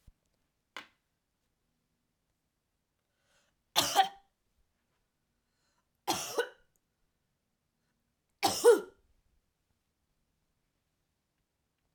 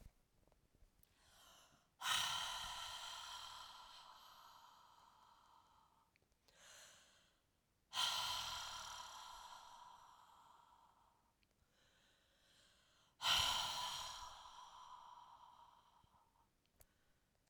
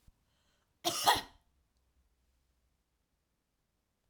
{"three_cough_length": "11.9 s", "three_cough_amplitude": 9964, "three_cough_signal_mean_std_ratio": 0.19, "exhalation_length": "17.5 s", "exhalation_amplitude": 2352, "exhalation_signal_mean_std_ratio": 0.42, "cough_length": "4.1 s", "cough_amplitude": 7951, "cough_signal_mean_std_ratio": 0.21, "survey_phase": "beta (2021-08-13 to 2022-03-07)", "age": "45-64", "gender": "Female", "wearing_mask": "No", "symptom_cough_any": true, "symptom_runny_or_blocked_nose": true, "symptom_headache": true, "smoker_status": "Never smoked", "respiratory_condition_asthma": false, "respiratory_condition_other": false, "recruitment_source": "Test and Trace", "submission_delay": "1 day", "covid_test_result": "Positive", "covid_test_method": "LFT"}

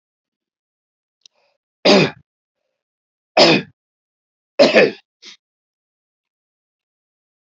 {"three_cough_length": "7.4 s", "three_cough_amplitude": 32124, "three_cough_signal_mean_std_ratio": 0.26, "survey_phase": "alpha (2021-03-01 to 2021-08-12)", "age": "65+", "gender": "Male", "wearing_mask": "No", "symptom_fatigue": true, "smoker_status": "Never smoked", "respiratory_condition_asthma": false, "respiratory_condition_other": false, "recruitment_source": "REACT", "submission_delay": "2 days", "covid_test_method": "RT-qPCR"}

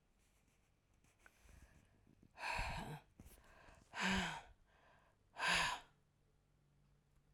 {"exhalation_length": "7.3 s", "exhalation_amplitude": 1941, "exhalation_signal_mean_std_ratio": 0.39, "survey_phase": "alpha (2021-03-01 to 2021-08-12)", "age": "45-64", "gender": "Female", "wearing_mask": "No", "symptom_abdominal_pain": true, "symptom_onset": "12 days", "smoker_status": "Never smoked", "respiratory_condition_asthma": false, "respiratory_condition_other": false, "recruitment_source": "REACT", "submission_delay": "1 day", "covid_test_result": "Negative", "covid_test_method": "RT-qPCR"}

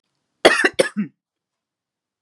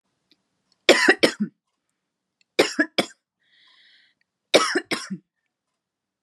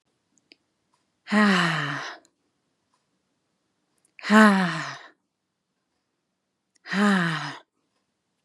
{"cough_length": "2.2 s", "cough_amplitude": 32767, "cough_signal_mean_std_ratio": 0.29, "three_cough_length": "6.2 s", "three_cough_amplitude": 31853, "three_cough_signal_mean_std_ratio": 0.28, "exhalation_length": "8.4 s", "exhalation_amplitude": 27422, "exhalation_signal_mean_std_ratio": 0.36, "survey_phase": "beta (2021-08-13 to 2022-03-07)", "age": "45-64", "gender": "Female", "wearing_mask": "No", "symptom_none": true, "smoker_status": "Never smoked", "respiratory_condition_asthma": false, "respiratory_condition_other": false, "recruitment_source": "Test and Trace", "submission_delay": "1 day", "covid_test_result": "Negative", "covid_test_method": "RT-qPCR"}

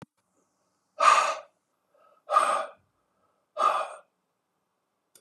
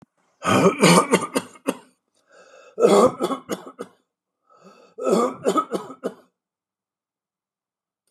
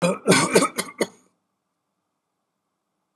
{"exhalation_length": "5.2 s", "exhalation_amplitude": 19440, "exhalation_signal_mean_std_ratio": 0.34, "three_cough_length": "8.1 s", "three_cough_amplitude": 28978, "three_cough_signal_mean_std_ratio": 0.39, "cough_length": "3.2 s", "cough_amplitude": 26081, "cough_signal_mean_std_ratio": 0.35, "survey_phase": "beta (2021-08-13 to 2022-03-07)", "age": "65+", "gender": "Male", "wearing_mask": "No", "symptom_none": true, "smoker_status": "Ex-smoker", "respiratory_condition_asthma": false, "respiratory_condition_other": false, "recruitment_source": "REACT", "submission_delay": "0 days", "covid_test_result": "Negative", "covid_test_method": "RT-qPCR", "influenza_a_test_result": "Negative", "influenza_b_test_result": "Negative"}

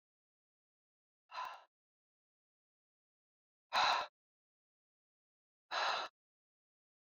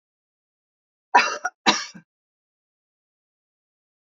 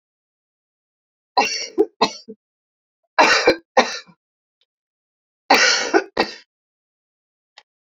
{"exhalation_length": "7.2 s", "exhalation_amplitude": 3368, "exhalation_signal_mean_std_ratio": 0.26, "cough_length": "4.1 s", "cough_amplitude": 27659, "cough_signal_mean_std_ratio": 0.22, "three_cough_length": "7.9 s", "three_cough_amplitude": 28626, "three_cough_signal_mean_std_ratio": 0.33, "survey_phase": "beta (2021-08-13 to 2022-03-07)", "age": "65+", "gender": "Female", "wearing_mask": "No", "symptom_none": true, "smoker_status": "Ex-smoker", "respiratory_condition_asthma": false, "respiratory_condition_other": false, "recruitment_source": "REACT", "submission_delay": "1 day", "covid_test_result": "Negative", "covid_test_method": "RT-qPCR"}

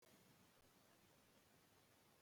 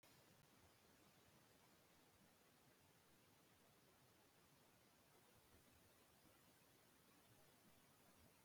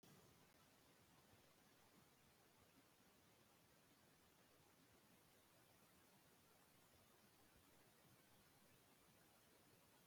{"cough_length": "2.2 s", "cough_amplitude": 37, "cough_signal_mean_std_ratio": 1.14, "exhalation_length": "8.4 s", "exhalation_amplitude": 38, "exhalation_signal_mean_std_ratio": 1.17, "three_cough_length": "10.1 s", "three_cough_amplitude": 43, "three_cough_signal_mean_std_ratio": 1.16, "survey_phase": "beta (2021-08-13 to 2022-03-07)", "age": "65+", "gender": "Male", "wearing_mask": "No", "symptom_none": true, "smoker_status": "Never smoked", "respiratory_condition_asthma": false, "respiratory_condition_other": false, "recruitment_source": "REACT", "submission_delay": "1 day", "covid_test_result": "Negative", "covid_test_method": "RT-qPCR", "influenza_a_test_result": "Negative", "influenza_b_test_result": "Negative"}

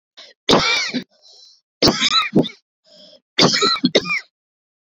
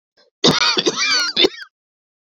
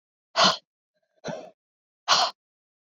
{"three_cough_length": "4.9 s", "three_cough_amplitude": 32767, "three_cough_signal_mean_std_ratio": 0.49, "cough_length": "2.2 s", "cough_amplitude": 31974, "cough_signal_mean_std_ratio": 0.55, "exhalation_length": "3.0 s", "exhalation_amplitude": 17244, "exhalation_signal_mean_std_ratio": 0.31, "survey_phase": "beta (2021-08-13 to 2022-03-07)", "age": "18-44", "gender": "Female", "wearing_mask": "No", "symptom_shortness_of_breath": true, "symptom_fatigue": true, "smoker_status": "Never smoked", "respiratory_condition_asthma": false, "respiratory_condition_other": false, "recruitment_source": "REACT", "submission_delay": "1 day", "covid_test_result": "Negative", "covid_test_method": "RT-qPCR", "influenza_a_test_result": "Negative", "influenza_b_test_result": "Negative"}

